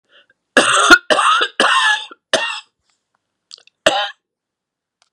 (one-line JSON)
{"three_cough_length": "5.1 s", "three_cough_amplitude": 32768, "three_cough_signal_mean_std_ratio": 0.44, "survey_phase": "beta (2021-08-13 to 2022-03-07)", "age": "65+", "gender": "Female", "wearing_mask": "No", "symptom_cough_any": true, "symptom_headache": true, "symptom_onset": "12 days", "smoker_status": "Never smoked", "respiratory_condition_asthma": false, "respiratory_condition_other": false, "recruitment_source": "REACT", "submission_delay": "2 days", "covid_test_result": "Negative", "covid_test_method": "RT-qPCR", "influenza_a_test_result": "Negative", "influenza_b_test_result": "Negative"}